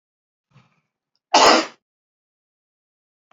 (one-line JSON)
{"cough_length": "3.3 s", "cough_amplitude": 29778, "cough_signal_mean_std_ratio": 0.24, "survey_phase": "alpha (2021-03-01 to 2021-08-12)", "age": "45-64", "gender": "Male", "wearing_mask": "No", "symptom_cough_any": true, "smoker_status": "Never smoked", "respiratory_condition_asthma": false, "respiratory_condition_other": false, "recruitment_source": "Test and Trace", "submission_delay": "1 day", "covid_test_result": "Positive", "covid_test_method": "RT-qPCR", "covid_ct_value": 16.3, "covid_ct_gene": "ORF1ab gene", "covid_ct_mean": 16.5, "covid_viral_load": "3900000 copies/ml", "covid_viral_load_category": "High viral load (>1M copies/ml)"}